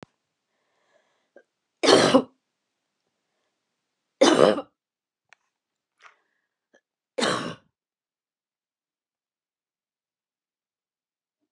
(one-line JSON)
{"three_cough_length": "11.5 s", "three_cough_amplitude": 27537, "three_cough_signal_mean_std_ratio": 0.21, "survey_phase": "beta (2021-08-13 to 2022-03-07)", "age": "45-64", "gender": "Female", "wearing_mask": "No", "symptom_cough_any": true, "symptom_fatigue": true, "smoker_status": "Never smoked", "respiratory_condition_asthma": true, "respiratory_condition_other": false, "recruitment_source": "REACT", "submission_delay": "1 day", "covid_test_result": "Negative", "covid_test_method": "RT-qPCR"}